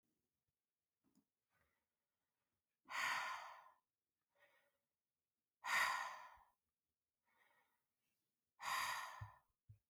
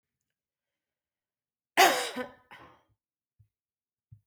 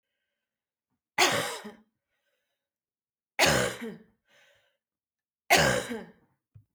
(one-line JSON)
{"exhalation_length": "9.9 s", "exhalation_amplitude": 1412, "exhalation_signal_mean_std_ratio": 0.33, "cough_length": "4.3 s", "cough_amplitude": 16164, "cough_signal_mean_std_ratio": 0.21, "three_cough_length": "6.7 s", "three_cough_amplitude": 15306, "three_cough_signal_mean_std_ratio": 0.32, "survey_phase": "beta (2021-08-13 to 2022-03-07)", "age": "45-64", "gender": "Female", "wearing_mask": "No", "symptom_cough_any": true, "symptom_runny_or_blocked_nose": true, "symptom_fatigue": true, "symptom_headache": true, "symptom_other": true, "smoker_status": "Ex-smoker", "respiratory_condition_asthma": false, "respiratory_condition_other": false, "recruitment_source": "Test and Trace", "submission_delay": "0 days", "covid_test_result": "Positive", "covid_test_method": "LFT"}